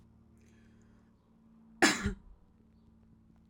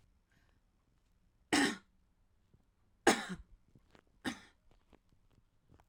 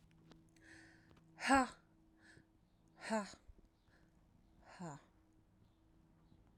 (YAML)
cough_length: 3.5 s
cough_amplitude: 8590
cough_signal_mean_std_ratio: 0.25
three_cough_length: 5.9 s
three_cough_amplitude: 9387
three_cough_signal_mean_std_ratio: 0.23
exhalation_length: 6.6 s
exhalation_amplitude: 3552
exhalation_signal_mean_std_ratio: 0.26
survey_phase: alpha (2021-03-01 to 2021-08-12)
age: 18-44
gender: Female
wearing_mask: 'No'
symptom_none: true
smoker_status: Ex-smoker
respiratory_condition_asthma: false
respiratory_condition_other: false
recruitment_source: REACT
submission_delay: 0 days
covid_test_result: Negative
covid_test_method: RT-qPCR